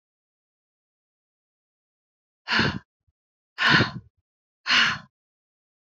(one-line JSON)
{"exhalation_length": "5.9 s", "exhalation_amplitude": 19523, "exhalation_signal_mean_std_ratio": 0.3, "survey_phase": "beta (2021-08-13 to 2022-03-07)", "age": "18-44", "gender": "Female", "wearing_mask": "No", "symptom_none": true, "smoker_status": "Never smoked", "respiratory_condition_asthma": false, "respiratory_condition_other": false, "recruitment_source": "Test and Trace", "submission_delay": "0 days", "covid_test_result": "Negative", "covid_test_method": "LFT"}